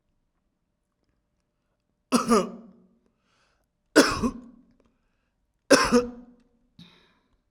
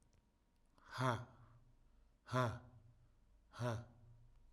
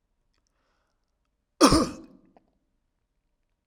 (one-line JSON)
{"three_cough_length": "7.5 s", "three_cough_amplitude": 27577, "three_cough_signal_mean_std_ratio": 0.27, "exhalation_length": "4.5 s", "exhalation_amplitude": 2379, "exhalation_signal_mean_std_ratio": 0.4, "cough_length": "3.7 s", "cough_amplitude": 21835, "cough_signal_mean_std_ratio": 0.21, "survey_phase": "alpha (2021-03-01 to 2021-08-12)", "age": "45-64", "gender": "Male", "wearing_mask": "No", "symptom_none": true, "smoker_status": "Ex-smoker", "respiratory_condition_asthma": false, "respiratory_condition_other": false, "recruitment_source": "REACT", "submission_delay": "1 day", "covid_test_result": "Negative", "covid_test_method": "RT-qPCR"}